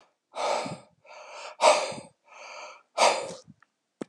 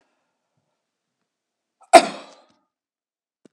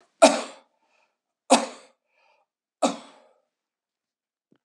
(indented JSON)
{
  "exhalation_length": "4.1 s",
  "exhalation_amplitude": 16458,
  "exhalation_signal_mean_std_ratio": 0.39,
  "cough_length": "3.5 s",
  "cough_amplitude": 32768,
  "cough_signal_mean_std_ratio": 0.13,
  "three_cough_length": "4.6 s",
  "three_cough_amplitude": 29961,
  "three_cough_signal_mean_std_ratio": 0.21,
  "survey_phase": "beta (2021-08-13 to 2022-03-07)",
  "age": "65+",
  "gender": "Male",
  "wearing_mask": "No",
  "symptom_none": true,
  "smoker_status": "Ex-smoker",
  "respiratory_condition_asthma": false,
  "respiratory_condition_other": false,
  "recruitment_source": "REACT",
  "submission_delay": "4 days",
  "covid_test_result": "Negative",
  "covid_test_method": "RT-qPCR"
}